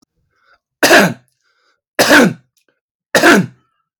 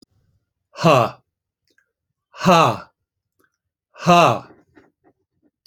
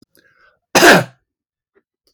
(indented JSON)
{
  "three_cough_length": "4.0 s",
  "three_cough_amplitude": 32767,
  "three_cough_signal_mean_std_ratio": 0.41,
  "exhalation_length": "5.7 s",
  "exhalation_amplitude": 28634,
  "exhalation_signal_mean_std_ratio": 0.31,
  "cough_length": "2.1 s",
  "cough_amplitude": 32768,
  "cough_signal_mean_std_ratio": 0.31,
  "survey_phase": "beta (2021-08-13 to 2022-03-07)",
  "age": "45-64",
  "gender": "Male",
  "wearing_mask": "No",
  "symptom_none": true,
  "smoker_status": "Never smoked",
  "respiratory_condition_asthma": false,
  "respiratory_condition_other": false,
  "recruitment_source": "REACT",
  "submission_delay": "1 day",
  "covid_test_result": "Negative",
  "covid_test_method": "RT-qPCR"
}